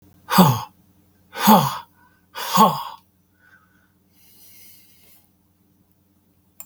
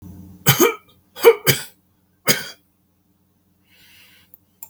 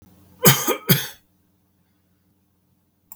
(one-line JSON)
{"exhalation_length": "6.7 s", "exhalation_amplitude": 32766, "exhalation_signal_mean_std_ratio": 0.3, "three_cough_length": "4.7 s", "three_cough_amplitude": 32768, "three_cough_signal_mean_std_ratio": 0.28, "cough_length": "3.2 s", "cough_amplitude": 32768, "cough_signal_mean_std_ratio": 0.27, "survey_phase": "beta (2021-08-13 to 2022-03-07)", "age": "65+", "gender": "Male", "wearing_mask": "No", "symptom_none": true, "smoker_status": "Never smoked", "respiratory_condition_asthma": false, "respiratory_condition_other": false, "recruitment_source": "REACT", "submission_delay": "2 days", "covid_test_result": "Negative", "covid_test_method": "RT-qPCR", "influenza_a_test_result": "Negative", "influenza_b_test_result": "Negative"}